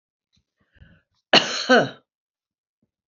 {"cough_length": "3.1 s", "cough_amplitude": 28674, "cough_signal_mean_std_ratio": 0.27, "survey_phase": "beta (2021-08-13 to 2022-03-07)", "age": "65+", "gender": "Female", "wearing_mask": "No", "symptom_none": true, "smoker_status": "Never smoked", "respiratory_condition_asthma": false, "respiratory_condition_other": true, "recruitment_source": "REACT", "submission_delay": "2 days", "covid_test_result": "Negative", "covid_test_method": "RT-qPCR", "influenza_a_test_result": "Unknown/Void", "influenza_b_test_result": "Unknown/Void"}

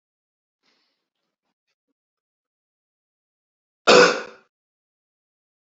{"cough_length": "5.6 s", "cough_amplitude": 29686, "cough_signal_mean_std_ratio": 0.18, "survey_phase": "beta (2021-08-13 to 2022-03-07)", "age": "45-64", "gender": "Male", "wearing_mask": "No", "symptom_none": true, "smoker_status": "Current smoker (1 to 10 cigarettes per day)", "respiratory_condition_asthma": false, "respiratory_condition_other": false, "recruitment_source": "REACT", "submission_delay": "1 day", "covid_test_result": "Negative", "covid_test_method": "RT-qPCR", "influenza_a_test_result": "Negative", "influenza_b_test_result": "Negative"}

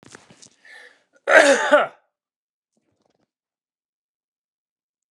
{"cough_length": "5.1 s", "cough_amplitude": 29204, "cough_signal_mean_std_ratio": 0.26, "survey_phase": "alpha (2021-03-01 to 2021-08-12)", "age": "45-64", "gender": "Male", "wearing_mask": "No", "symptom_none": true, "smoker_status": "Never smoked", "respiratory_condition_asthma": false, "respiratory_condition_other": false, "recruitment_source": "REACT", "submission_delay": "3 days", "covid_test_result": "Negative", "covid_test_method": "RT-qPCR"}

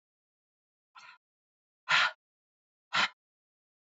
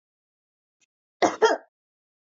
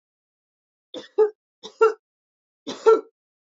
{"exhalation_length": "3.9 s", "exhalation_amplitude": 8529, "exhalation_signal_mean_std_ratio": 0.24, "cough_length": "2.2 s", "cough_amplitude": 20369, "cough_signal_mean_std_ratio": 0.26, "three_cough_length": "3.5 s", "three_cough_amplitude": 19130, "three_cough_signal_mean_std_ratio": 0.28, "survey_phase": "beta (2021-08-13 to 2022-03-07)", "age": "45-64", "gender": "Female", "wearing_mask": "Yes", "symptom_cough_any": true, "symptom_runny_or_blocked_nose": true, "symptom_fatigue": true, "symptom_headache": true, "smoker_status": "Never smoked", "respiratory_condition_asthma": false, "respiratory_condition_other": false, "recruitment_source": "Test and Trace", "submission_delay": "2 days", "covid_test_result": "Positive", "covid_test_method": "RT-qPCR", "covid_ct_value": 22.2, "covid_ct_gene": "ORF1ab gene"}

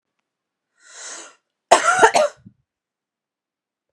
{"cough_length": "3.9 s", "cough_amplitude": 32768, "cough_signal_mean_std_ratio": 0.28, "survey_phase": "beta (2021-08-13 to 2022-03-07)", "age": "18-44", "gender": "Female", "wearing_mask": "No", "symptom_none": true, "smoker_status": "Never smoked", "respiratory_condition_asthma": false, "respiratory_condition_other": false, "recruitment_source": "REACT", "submission_delay": "1 day", "covid_test_result": "Negative", "covid_test_method": "RT-qPCR"}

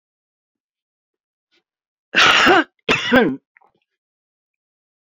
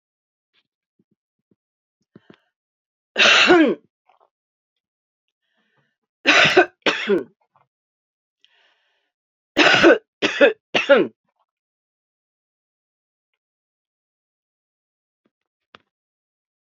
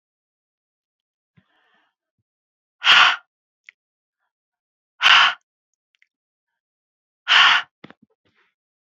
{"cough_length": "5.1 s", "cough_amplitude": 28876, "cough_signal_mean_std_ratio": 0.33, "three_cough_length": "16.7 s", "three_cough_amplitude": 30079, "three_cough_signal_mean_std_ratio": 0.28, "exhalation_length": "9.0 s", "exhalation_amplitude": 29151, "exhalation_signal_mean_std_ratio": 0.25, "survey_phase": "beta (2021-08-13 to 2022-03-07)", "age": "65+", "gender": "Female", "wearing_mask": "No", "symptom_cough_any": true, "symptom_runny_or_blocked_nose": true, "symptom_sore_throat": true, "symptom_fatigue": true, "symptom_other": true, "symptom_onset": "8 days", "smoker_status": "Never smoked", "respiratory_condition_asthma": false, "respiratory_condition_other": false, "recruitment_source": "REACT", "submission_delay": "2 days", "covid_test_result": "Negative", "covid_test_method": "RT-qPCR", "influenza_a_test_result": "Unknown/Void", "influenza_b_test_result": "Unknown/Void"}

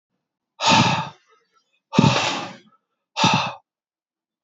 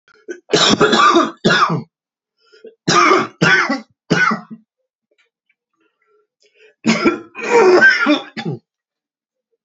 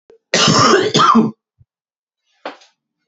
{"exhalation_length": "4.4 s", "exhalation_amplitude": 27208, "exhalation_signal_mean_std_ratio": 0.42, "three_cough_length": "9.6 s", "three_cough_amplitude": 31995, "three_cough_signal_mean_std_ratio": 0.5, "cough_length": "3.1 s", "cough_amplitude": 31125, "cough_signal_mean_std_ratio": 0.49, "survey_phase": "beta (2021-08-13 to 2022-03-07)", "age": "45-64", "gender": "Male", "wearing_mask": "No", "symptom_runny_or_blocked_nose": true, "symptom_headache": true, "symptom_onset": "2 days", "smoker_status": "Never smoked", "respiratory_condition_asthma": false, "respiratory_condition_other": false, "recruitment_source": "Test and Trace", "submission_delay": "2 days", "covid_test_result": "Positive", "covid_test_method": "RT-qPCR"}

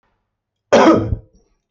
{"cough_length": "1.7 s", "cough_amplitude": 32767, "cough_signal_mean_std_ratio": 0.4, "survey_phase": "beta (2021-08-13 to 2022-03-07)", "age": "45-64", "gender": "Male", "wearing_mask": "No", "symptom_none": true, "smoker_status": "Ex-smoker", "respiratory_condition_asthma": false, "respiratory_condition_other": false, "recruitment_source": "REACT", "submission_delay": "2 days", "covid_test_result": "Negative", "covid_test_method": "RT-qPCR"}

